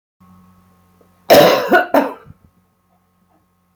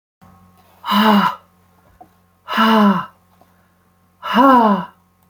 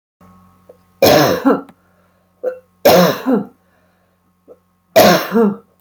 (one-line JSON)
{"cough_length": "3.8 s", "cough_amplitude": 32767, "cough_signal_mean_std_ratio": 0.34, "exhalation_length": "5.3 s", "exhalation_amplitude": 28512, "exhalation_signal_mean_std_ratio": 0.47, "three_cough_length": "5.8 s", "three_cough_amplitude": 32767, "three_cough_signal_mean_std_ratio": 0.45, "survey_phase": "beta (2021-08-13 to 2022-03-07)", "age": "45-64", "gender": "Female", "wearing_mask": "No", "symptom_none": true, "smoker_status": "Current smoker (11 or more cigarettes per day)", "respiratory_condition_asthma": false, "respiratory_condition_other": false, "recruitment_source": "Test and Trace", "submission_delay": "1 day", "covid_test_result": "Negative", "covid_test_method": "ePCR"}